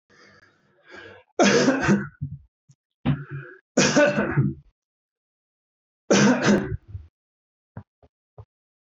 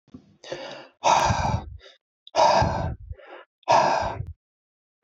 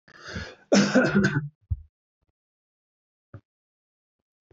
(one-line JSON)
{"three_cough_length": "9.0 s", "three_cough_amplitude": 16574, "three_cough_signal_mean_std_ratio": 0.42, "exhalation_length": "5.0 s", "exhalation_amplitude": 15648, "exhalation_signal_mean_std_ratio": 0.51, "cough_length": "4.5 s", "cough_amplitude": 13425, "cough_signal_mean_std_ratio": 0.34, "survey_phase": "beta (2021-08-13 to 2022-03-07)", "age": "45-64", "gender": "Male", "wearing_mask": "No", "symptom_fatigue": true, "smoker_status": "Never smoked", "respiratory_condition_asthma": false, "respiratory_condition_other": false, "recruitment_source": "REACT", "submission_delay": "1 day", "covid_test_result": "Negative", "covid_test_method": "RT-qPCR"}